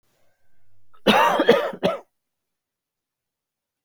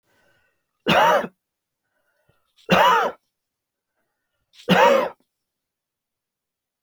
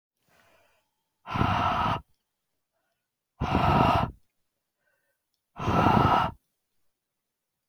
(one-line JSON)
{"cough_length": "3.8 s", "cough_amplitude": 28118, "cough_signal_mean_std_ratio": 0.36, "three_cough_length": "6.8 s", "three_cough_amplitude": 21713, "three_cough_signal_mean_std_ratio": 0.34, "exhalation_length": "7.7 s", "exhalation_amplitude": 13433, "exhalation_signal_mean_std_ratio": 0.42, "survey_phase": "beta (2021-08-13 to 2022-03-07)", "age": "45-64", "gender": "Male", "wearing_mask": "No", "symptom_none": true, "smoker_status": "Never smoked", "respiratory_condition_asthma": false, "respiratory_condition_other": false, "recruitment_source": "REACT", "submission_delay": "1 day", "covid_test_result": "Negative", "covid_test_method": "RT-qPCR"}